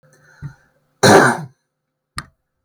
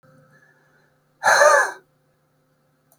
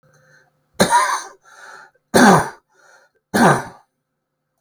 {"cough_length": "2.6 s", "cough_amplitude": 32768, "cough_signal_mean_std_ratio": 0.31, "exhalation_length": "3.0 s", "exhalation_amplitude": 29205, "exhalation_signal_mean_std_ratio": 0.32, "three_cough_length": "4.6 s", "three_cough_amplitude": 32768, "three_cough_signal_mean_std_ratio": 0.37, "survey_phase": "beta (2021-08-13 to 2022-03-07)", "age": "45-64", "gender": "Male", "wearing_mask": "No", "symptom_none": true, "smoker_status": "Never smoked", "respiratory_condition_asthma": false, "respiratory_condition_other": false, "recruitment_source": "REACT", "submission_delay": "1 day", "covid_test_result": "Negative", "covid_test_method": "RT-qPCR"}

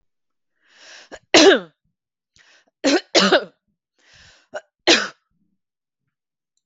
{"three_cough_length": "6.7 s", "three_cough_amplitude": 32768, "three_cough_signal_mean_std_ratio": 0.28, "survey_phase": "beta (2021-08-13 to 2022-03-07)", "age": "45-64", "gender": "Female", "wearing_mask": "No", "symptom_none": true, "smoker_status": "Never smoked", "respiratory_condition_asthma": false, "respiratory_condition_other": false, "recruitment_source": "REACT", "submission_delay": "2 days", "covid_test_result": "Negative", "covid_test_method": "RT-qPCR"}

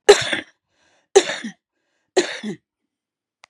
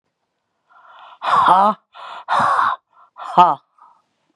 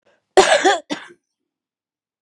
{"three_cough_length": "3.5 s", "three_cough_amplitude": 32768, "three_cough_signal_mean_std_ratio": 0.27, "exhalation_length": "4.4 s", "exhalation_amplitude": 32768, "exhalation_signal_mean_std_ratio": 0.43, "cough_length": "2.2 s", "cough_amplitude": 32767, "cough_signal_mean_std_ratio": 0.34, "survey_phase": "beta (2021-08-13 to 2022-03-07)", "age": "65+", "gender": "Female", "wearing_mask": "No", "symptom_none": true, "smoker_status": "Current smoker (e-cigarettes or vapes only)", "respiratory_condition_asthma": false, "respiratory_condition_other": false, "recruitment_source": "REACT", "submission_delay": "2 days", "covid_test_result": "Negative", "covid_test_method": "RT-qPCR"}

